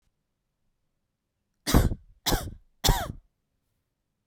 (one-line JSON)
{"three_cough_length": "4.3 s", "three_cough_amplitude": 17101, "three_cough_signal_mean_std_ratio": 0.29, "survey_phase": "beta (2021-08-13 to 2022-03-07)", "age": "18-44", "gender": "Female", "wearing_mask": "No", "symptom_other": true, "smoker_status": "Never smoked", "respiratory_condition_asthma": false, "respiratory_condition_other": false, "recruitment_source": "REACT", "submission_delay": "6 days", "covid_test_result": "Negative", "covid_test_method": "RT-qPCR", "influenza_a_test_result": "Negative", "influenza_b_test_result": "Negative"}